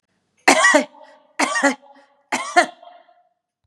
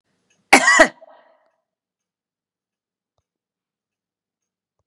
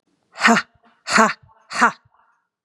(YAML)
three_cough_length: 3.7 s
three_cough_amplitude: 32768
three_cough_signal_mean_std_ratio: 0.39
cough_length: 4.9 s
cough_amplitude: 32768
cough_signal_mean_std_ratio: 0.2
exhalation_length: 2.6 s
exhalation_amplitude: 32362
exhalation_signal_mean_std_ratio: 0.37
survey_phase: beta (2021-08-13 to 2022-03-07)
age: 45-64
gender: Female
wearing_mask: 'No'
symptom_runny_or_blocked_nose: true
symptom_fatigue: true
smoker_status: Ex-smoker
respiratory_condition_asthma: false
respiratory_condition_other: false
recruitment_source: REACT
submission_delay: 1 day
covid_test_result: Negative
covid_test_method: RT-qPCR
influenza_a_test_result: Unknown/Void
influenza_b_test_result: Unknown/Void